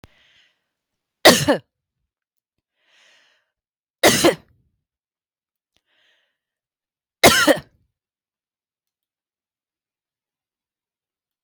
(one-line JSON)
{"three_cough_length": "11.4 s", "three_cough_amplitude": 32768, "three_cough_signal_mean_std_ratio": 0.21, "survey_phase": "beta (2021-08-13 to 2022-03-07)", "age": "45-64", "gender": "Female", "wearing_mask": "No", "symptom_none": true, "smoker_status": "Ex-smoker", "respiratory_condition_asthma": true, "respiratory_condition_other": false, "recruitment_source": "REACT", "submission_delay": "2 days", "covid_test_result": "Negative", "covid_test_method": "RT-qPCR", "influenza_a_test_result": "Negative", "influenza_b_test_result": "Negative"}